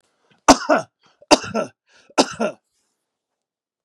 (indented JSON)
{
  "three_cough_length": "3.8 s",
  "three_cough_amplitude": 32768,
  "three_cough_signal_mean_std_ratio": 0.28,
  "survey_phase": "beta (2021-08-13 to 2022-03-07)",
  "age": "45-64",
  "gender": "Male",
  "wearing_mask": "No",
  "symptom_none": true,
  "smoker_status": "Ex-smoker",
  "respiratory_condition_asthma": false,
  "respiratory_condition_other": true,
  "recruitment_source": "Test and Trace",
  "submission_delay": "1 day",
  "covid_test_result": "Negative",
  "covid_test_method": "RT-qPCR"
}